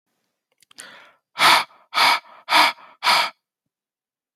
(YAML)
exhalation_length: 4.4 s
exhalation_amplitude: 27926
exhalation_signal_mean_std_ratio: 0.38
survey_phase: beta (2021-08-13 to 2022-03-07)
age: 45-64
gender: Male
wearing_mask: 'No'
symptom_none: true
smoker_status: Never smoked
respiratory_condition_asthma: false
respiratory_condition_other: false
recruitment_source: REACT
submission_delay: 2 days
covid_test_result: Negative
covid_test_method: RT-qPCR